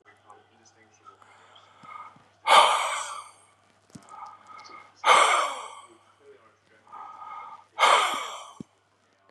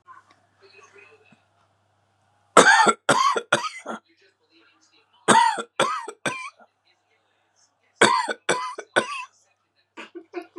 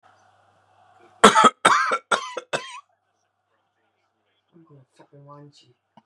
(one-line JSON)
{"exhalation_length": "9.3 s", "exhalation_amplitude": 22517, "exhalation_signal_mean_std_ratio": 0.35, "three_cough_length": "10.6 s", "three_cough_amplitude": 32768, "three_cough_signal_mean_std_ratio": 0.34, "cough_length": "6.1 s", "cough_amplitude": 32768, "cough_signal_mean_std_ratio": 0.26, "survey_phase": "beta (2021-08-13 to 2022-03-07)", "age": "65+", "gender": "Male", "wearing_mask": "No", "symptom_none": true, "smoker_status": "Never smoked", "respiratory_condition_asthma": false, "respiratory_condition_other": false, "recruitment_source": "REACT", "submission_delay": "2 days", "covid_test_result": "Negative", "covid_test_method": "RT-qPCR", "influenza_a_test_result": "Negative", "influenza_b_test_result": "Negative"}